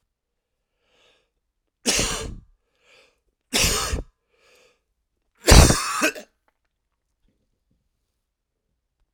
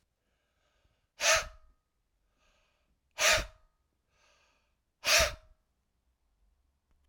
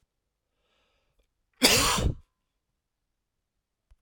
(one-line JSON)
{"three_cough_length": "9.1 s", "three_cough_amplitude": 32768, "three_cough_signal_mean_std_ratio": 0.26, "exhalation_length": "7.1 s", "exhalation_amplitude": 8369, "exhalation_signal_mean_std_ratio": 0.26, "cough_length": "4.0 s", "cough_amplitude": 16990, "cough_signal_mean_std_ratio": 0.28, "survey_phase": "alpha (2021-03-01 to 2021-08-12)", "age": "45-64", "gender": "Male", "wearing_mask": "No", "symptom_cough_any": true, "symptom_shortness_of_breath": true, "symptom_abdominal_pain": true, "symptom_fatigue": true, "symptom_headache": true, "symptom_change_to_sense_of_smell_or_taste": true, "symptom_onset": "3 days", "smoker_status": "Never smoked", "respiratory_condition_asthma": false, "respiratory_condition_other": false, "recruitment_source": "Test and Trace", "submission_delay": "1 day", "covid_test_result": "Positive", "covid_test_method": "RT-qPCR", "covid_ct_value": 17.8, "covid_ct_gene": "N gene"}